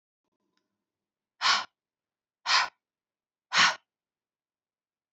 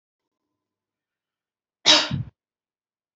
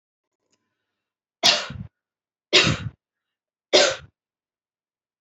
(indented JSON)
{
  "exhalation_length": "5.1 s",
  "exhalation_amplitude": 11677,
  "exhalation_signal_mean_std_ratio": 0.27,
  "cough_length": "3.2 s",
  "cough_amplitude": 31778,
  "cough_signal_mean_std_ratio": 0.22,
  "three_cough_length": "5.2 s",
  "three_cough_amplitude": 26714,
  "three_cough_signal_mean_std_ratio": 0.28,
  "survey_phase": "beta (2021-08-13 to 2022-03-07)",
  "age": "18-44",
  "gender": "Female",
  "wearing_mask": "No",
  "symptom_none": true,
  "smoker_status": "Never smoked",
  "respiratory_condition_asthma": false,
  "respiratory_condition_other": false,
  "recruitment_source": "REACT",
  "submission_delay": "2 days",
  "covid_test_result": "Negative",
  "covid_test_method": "RT-qPCR",
  "influenza_a_test_result": "Unknown/Void",
  "influenza_b_test_result": "Unknown/Void"
}